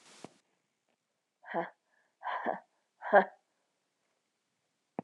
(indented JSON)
{
  "exhalation_length": "5.0 s",
  "exhalation_amplitude": 10084,
  "exhalation_signal_mean_std_ratio": 0.22,
  "survey_phase": "beta (2021-08-13 to 2022-03-07)",
  "age": "18-44",
  "gender": "Female",
  "wearing_mask": "No",
  "symptom_cough_any": true,
  "symptom_runny_or_blocked_nose": true,
  "symptom_shortness_of_breath": true,
  "symptom_sore_throat": true,
  "symptom_fatigue": true,
  "symptom_fever_high_temperature": true,
  "symptom_headache": true,
  "symptom_onset": "1 day",
  "smoker_status": "Ex-smoker",
  "respiratory_condition_asthma": false,
  "respiratory_condition_other": false,
  "recruitment_source": "Test and Trace",
  "submission_delay": "1 day",
  "covid_test_result": "Positive",
  "covid_test_method": "RT-qPCR",
  "covid_ct_value": 20.3,
  "covid_ct_gene": "N gene"
}